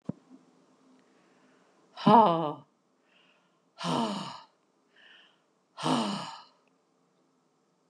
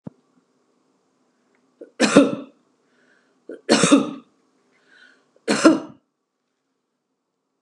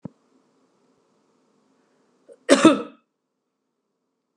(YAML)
exhalation_length: 7.9 s
exhalation_amplitude: 16223
exhalation_signal_mean_std_ratio: 0.29
three_cough_length: 7.6 s
three_cough_amplitude: 32768
three_cough_signal_mean_std_ratio: 0.28
cough_length: 4.4 s
cough_amplitude: 31867
cough_signal_mean_std_ratio: 0.19
survey_phase: beta (2021-08-13 to 2022-03-07)
age: 65+
gender: Female
wearing_mask: 'No'
symptom_none: true
smoker_status: Ex-smoker
respiratory_condition_asthma: false
respiratory_condition_other: false
recruitment_source: REACT
submission_delay: 2 days
covid_test_result: Negative
covid_test_method: RT-qPCR
influenza_a_test_result: Negative
influenza_b_test_result: Negative